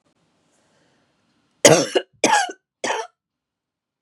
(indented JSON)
{
  "three_cough_length": "4.0 s",
  "three_cough_amplitude": 32768,
  "three_cough_signal_mean_std_ratio": 0.29,
  "survey_phase": "beta (2021-08-13 to 2022-03-07)",
  "age": "18-44",
  "gender": "Female",
  "wearing_mask": "No",
  "symptom_headache": true,
  "smoker_status": "Never smoked",
  "respiratory_condition_asthma": true,
  "respiratory_condition_other": false,
  "recruitment_source": "REACT",
  "submission_delay": "3 days",
  "covid_test_result": "Negative",
  "covid_test_method": "RT-qPCR",
  "influenza_a_test_result": "Negative",
  "influenza_b_test_result": "Negative"
}